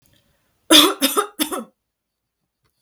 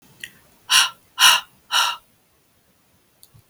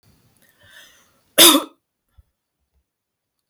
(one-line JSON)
{"three_cough_length": "2.8 s", "three_cough_amplitude": 32768, "three_cough_signal_mean_std_ratio": 0.32, "exhalation_length": "3.5 s", "exhalation_amplitude": 32766, "exhalation_signal_mean_std_ratio": 0.33, "cough_length": "3.5 s", "cough_amplitude": 32768, "cough_signal_mean_std_ratio": 0.21, "survey_phase": "beta (2021-08-13 to 2022-03-07)", "age": "45-64", "gender": "Female", "wearing_mask": "No", "symptom_none": true, "smoker_status": "Never smoked", "respiratory_condition_asthma": false, "respiratory_condition_other": false, "recruitment_source": "REACT", "submission_delay": "2 days", "covid_test_result": "Negative", "covid_test_method": "RT-qPCR"}